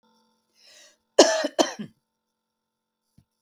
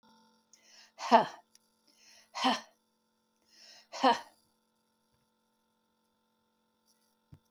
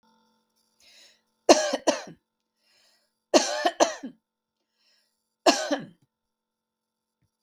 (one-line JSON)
{"cough_length": "3.4 s", "cough_amplitude": 32767, "cough_signal_mean_std_ratio": 0.23, "exhalation_length": "7.5 s", "exhalation_amplitude": 13403, "exhalation_signal_mean_std_ratio": 0.21, "three_cough_length": "7.4 s", "three_cough_amplitude": 32766, "three_cough_signal_mean_std_ratio": 0.26, "survey_phase": "beta (2021-08-13 to 2022-03-07)", "age": "65+", "gender": "Female", "wearing_mask": "No", "symptom_none": true, "smoker_status": "Ex-smoker", "respiratory_condition_asthma": false, "respiratory_condition_other": false, "recruitment_source": "REACT", "submission_delay": "1 day", "covid_test_result": "Negative", "covid_test_method": "RT-qPCR"}